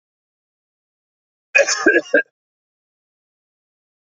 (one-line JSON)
{"cough_length": "4.2 s", "cough_amplitude": 29518, "cough_signal_mean_std_ratio": 0.26, "survey_phase": "beta (2021-08-13 to 2022-03-07)", "age": "45-64", "gender": "Male", "wearing_mask": "No", "symptom_none": true, "symptom_onset": "12 days", "smoker_status": "Never smoked", "respiratory_condition_asthma": false, "respiratory_condition_other": false, "recruitment_source": "REACT", "submission_delay": "1 day", "covid_test_result": "Negative", "covid_test_method": "RT-qPCR", "influenza_a_test_result": "Negative", "influenza_b_test_result": "Negative"}